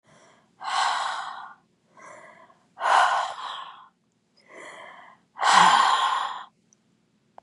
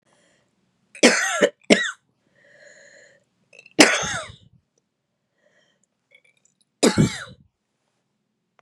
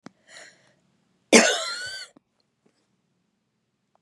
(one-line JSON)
{"exhalation_length": "7.4 s", "exhalation_amplitude": 24348, "exhalation_signal_mean_std_ratio": 0.44, "three_cough_length": "8.6 s", "three_cough_amplitude": 32768, "three_cough_signal_mean_std_ratio": 0.27, "cough_length": "4.0 s", "cough_amplitude": 30962, "cough_signal_mean_std_ratio": 0.23, "survey_phase": "beta (2021-08-13 to 2022-03-07)", "age": "45-64", "gender": "Female", "wearing_mask": "No", "symptom_cough_any": true, "symptom_new_continuous_cough": true, "symptom_runny_or_blocked_nose": true, "symptom_sore_throat": true, "symptom_other": true, "smoker_status": "Never smoked", "respiratory_condition_asthma": false, "respiratory_condition_other": false, "recruitment_source": "Test and Trace", "submission_delay": "3 days", "covid_test_result": "Negative", "covid_test_method": "RT-qPCR"}